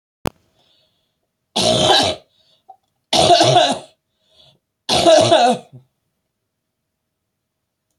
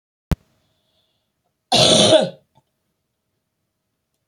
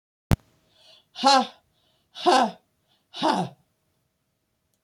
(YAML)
three_cough_length: 8.0 s
three_cough_amplitude: 31102
three_cough_signal_mean_std_ratio: 0.41
cough_length: 4.3 s
cough_amplitude: 31556
cough_signal_mean_std_ratio: 0.3
exhalation_length: 4.8 s
exhalation_amplitude: 20107
exhalation_signal_mean_std_ratio: 0.32
survey_phase: beta (2021-08-13 to 2022-03-07)
age: 65+
gender: Female
wearing_mask: 'No'
symptom_cough_any: true
symptom_new_continuous_cough: true
symptom_runny_or_blocked_nose: true
symptom_sore_throat: true
symptom_abdominal_pain: true
symptom_fatigue: true
symptom_fever_high_temperature: true
symptom_headache: true
smoker_status: Ex-smoker
respiratory_condition_asthma: false
respiratory_condition_other: false
recruitment_source: Test and Trace
submission_delay: 2 days
covid_test_result: Positive
covid_test_method: LFT